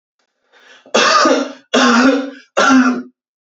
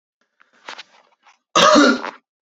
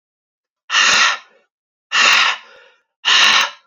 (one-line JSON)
{"three_cough_length": "3.4 s", "three_cough_amplitude": 30793, "three_cough_signal_mean_std_ratio": 0.62, "cough_length": "2.5 s", "cough_amplitude": 29617, "cough_signal_mean_std_ratio": 0.37, "exhalation_length": "3.7 s", "exhalation_amplitude": 32768, "exhalation_signal_mean_std_ratio": 0.53, "survey_phase": "beta (2021-08-13 to 2022-03-07)", "age": "18-44", "gender": "Male", "wearing_mask": "No", "symptom_none": true, "smoker_status": "Never smoked", "respiratory_condition_asthma": false, "respiratory_condition_other": false, "recruitment_source": "Test and Trace", "submission_delay": "1 day", "covid_test_result": "Negative", "covid_test_method": "RT-qPCR"}